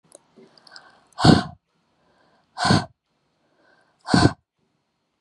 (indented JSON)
{
  "exhalation_length": "5.2 s",
  "exhalation_amplitude": 32397,
  "exhalation_signal_mean_std_ratio": 0.27,
  "survey_phase": "beta (2021-08-13 to 2022-03-07)",
  "age": "18-44",
  "gender": "Female",
  "wearing_mask": "No",
  "symptom_headache": true,
  "smoker_status": "Never smoked",
  "respiratory_condition_asthma": true,
  "respiratory_condition_other": false,
  "recruitment_source": "REACT",
  "submission_delay": "3 days",
  "covid_test_result": "Negative",
  "covid_test_method": "RT-qPCR",
  "influenza_a_test_result": "Negative",
  "influenza_b_test_result": "Negative"
}